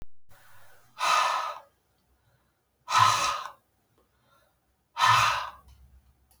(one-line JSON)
{"exhalation_length": "6.4 s", "exhalation_amplitude": 12974, "exhalation_signal_mean_std_ratio": 0.42, "survey_phase": "beta (2021-08-13 to 2022-03-07)", "age": "45-64", "gender": "Female", "wearing_mask": "No", "symptom_cough_any": true, "symptom_runny_or_blocked_nose": true, "symptom_sore_throat": true, "symptom_fatigue": true, "symptom_headache": true, "symptom_change_to_sense_of_smell_or_taste": true, "symptom_loss_of_taste": true, "symptom_onset": "6 days", "smoker_status": "Ex-smoker", "respiratory_condition_asthma": false, "respiratory_condition_other": false, "recruitment_source": "Test and Trace", "submission_delay": "1 day", "covid_test_result": "Positive", "covid_test_method": "RT-qPCR", "covid_ct_value": 23.1, "covid_ct_gene": "ORF1ab gene"}